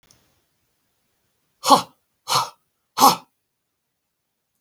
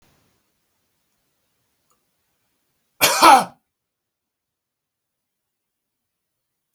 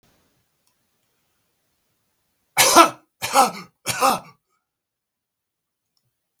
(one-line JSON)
{"exhalation_length": "4.6 s", "exhalation_amplitude": 32766, "exhalation_signal_mean_std_ratio": 0.24, "cough_length": "6.7 s", "cough_amplitude": 32768, "cough_signal_mean_std_ratio": 0.18, "three_cough_length": "6.4 s", "three_cough_amplitude": 32768, "three_cough_signal_mean_std_ratio": 0.26, "survey_phase": "beta (2021-08-13 to 2022-03-07)", "age": "65+", "gender": "Male", "wearing_mask": "No", "symptom_none": true, "smoker_status": "Never smoked", "respiratory_condition_asthma": false, "respiratory_condition_other": false, "recruitment_source": "REACT", "submission_delay": "15 days", "covid_test_result": "Negative", "covid_test_method": "RT-qPCR"}